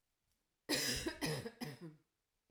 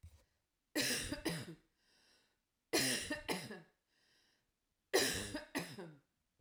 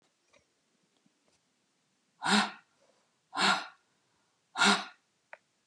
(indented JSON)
{
  "cough_length": "2.5 s",
  "cough_amplitude": 2743,
  "cough_signal_mean_std_ratio": 0.51,
  "three_cough_length": "6.4 s",
  "three_cough_amplitude": 3940,
  "three_cough_signal_mean_std_ratio": 0.44,
  "exhalation_length": "5.7 s",
  "exhalation_amplitude": 8260,
  "exhalation_signal_mean_std_ratio": 0.29,
  "survey_phase": "alpha (2021-03-01 to 2021-08-12)",
  "age": "45-64",
  "gender": "Female",
  "wearing_mask": "No",
  "symptom_none": true,
  "smoker_status": "Never smoked",
  "respiratory_condition_asthma": false,
  "respiratory_condition_other": false,
  "recruitment_source": "REACT",
  "submission_delay": "2 days",
  "covid_test_result": "Negative",
  "covid_test_method": "RT-qPCR"
}